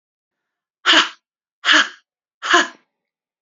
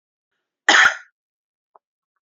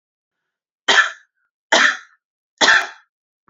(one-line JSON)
{"exhalation_length": "3.4 s", "exhalation_amplitude": 30048, "exhalation_signal_mean_std_ratio": 0.34, "cough_length": "2.2 s", "cough_amplitude": 29204, "cough_signal_mean_std_ratio": 0.26, "three_cough_length": "3.5 s", "three_cough_amplitude": 32768, "three_cough_signal_mean_std_ratio": 0.35, "survey_phase": "alpha (2021-03-01 to 2021-08-12)", "age": "45-64", "gender": "Female", "wearing_mask": "No", "symptom_none": true, "smoker_status": "Current smoker (11 or more cigarettes per day)", "respiratory_condition_asthma": false, "respiratory_condition_other": false, "recruitment_source": "REACT", "submission_delay": "2 days", "covid_test_result": "Negative", "covid_test_method": "RT-qPCR"}